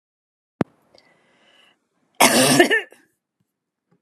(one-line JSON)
{"cough_length": "4.0 s", "cough_amplitude": 32767, "cough_signal_mean_std_ratio": 0.31, "survey_phase": "alpha (2021-03-01 to 2021-08-12)", "age": "65+", "gender": "Female", "wearing_mask": "No", "symptom_none": true, "smoker_status": "Never smoked", "respiratory_condition_asthma": false, "respiratory_condition_other": false, "recruitment_source": "REACT", "submission_delay": "1 day", "covid_test_result": "Negative", "covid_test_method": "RT-qPCR"}